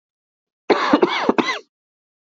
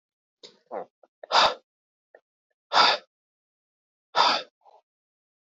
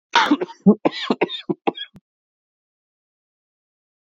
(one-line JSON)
{"cough_length": "2.3 s", "cough_amplitude": 26561, "cough_signal_mean_std_ratio": 0.42, "exhalation_length": "5.5 s", "exhalation_amplitude": 20963, "exhalation_signal_mean_std_ratio": 0.29, "three_cough_length": "4.0 s", "three_cough_amplitude": 26054, "three_cough_signal_mean_std_ratio": 0.31, "survey_phase": "beta (2021-08-13 to 2022-03-07)", "age": "18-44", "gender": "Male", "wearing_mask": "Yes", "symptom_cough_any": true, "symptom_fatigue": true, "symptom_fever_high_temperature": true, "symptom_headache": true, "symptom_change_to_sense_of_smell_or_taste": true, "symptom_loss_of_taste": true, "symptom_onset": "4 days", "smoker_status": "Never smoked", "respiratory_condition_asthma": false, "respiratory_condition_other": false, "recruitment_source": "Test and Trace", "submission_delay": "2 days", "covid_test_result": "Positive", "covid_test_method": "RT-qPCR", "covid_ct_value": 19.0, "covid_ct_gene": "ORF1ab gene", "covid_ct_mean": 19.9, "covid_viral_load": "290000 copies/ml", "covid_viral_load_category": "Low viral load (10K-1M copies/ml)"}